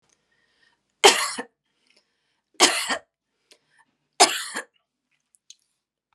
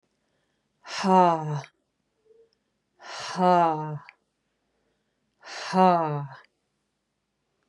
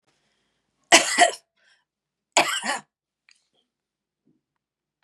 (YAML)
three_cough_length: 6.1 s
three_cough_amplitude: 32521
three_cough_signal_mean_std_ratio: 0.25
exhalation_length: 7.7 s
exhalation_amplitude: 17997
exhalation_signal_mean_std_ratio: 0.34
cough_length: 5.0 s
cough_amplitude: 32767
cough_signal_mean_std_ratio: 0.25
survey_phase: beta (2021-08-13 to 2022-03-07)
age: 45-64
gender: Female
wearing_mask: 'No'
symptom_headache: true
smoker_status: Never smoked
respiratory_condition_asthma: false
respiratory_condition_other: false
recruitment_source: REACT
submission_delay: 1 day
covid_test_result: Negative
covid_test_method: RT-qPCR
influenza_a_test_result: Negative
influenza_b_test_result: Negative